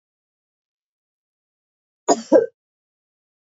{"cough_length": "3.5 s", "cough_amplitude": 27478, "cough_signal_mean_std_ratio": 0.19, "survey_phase": "alpha (2021-03-01 to 2021-08-12)", "age": "18-44", "gender": "Female", "wearing_mask": "No", "symptom_none": true, "smoker_status": "Never smoked", "respiratory_condition_asthma": false, "respiratory_condition_other": false, "recruitment_source": "REACT", "submission_delay": "2 days", "covid_test_result": "Negative", "covid_test_method": "RT-qPCR"}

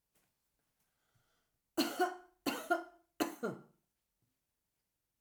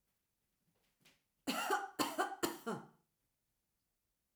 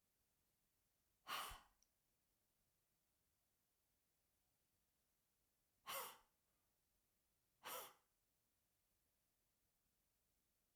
{"three_cough_length": "5.2 s", "three_cough_amplitude": 3521, "three_cough_signal_mean_std_ratio": 0.31, "cough_length": "4.4 s", "cough_amplitude": 3750, "cough_signal_mean_std_ratio": 0.38, "exhalation_length": "10.8 s", "exhalation_amplitude": 502, "exhalation_signal_mean_std_ratio": 0.26, "survey_phase": "alpha (2021-03-01 to 2021-08-12)", "age": "65+", "gender": "Female", "wearing_mask": "No", "symptom_none": true, "smoker_status": "Never smoked", "respiratory_condition_asthma": false, "respiratory_condition_other": false, "recruitment_source": "REACT", "submission_delay": "2 days", "covid_test_result": "Negative", "covid_test_method": "RT-qPCR"}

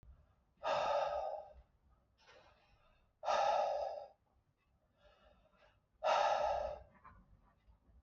{"exhalation_length": "8.0 s", "exhalation_amplitude": 2690, "exhalation_signal_mean_std_ratio": 0.47, "survey_phase": "beta (2021-08-13 to 2022-03-07)", "age": "45-64", "gender": "Male", "wearing_mask": "No", "symptom_none": true, "smoker_status": "Never smoked", "respiratory_condition_asthma": false, "respiratory_condition_other": false, "recruitment_source": "REACT", "submission_delay": "0 days", "covid_test_result": "Negative", "covid_test_method": "RT-qPCR"}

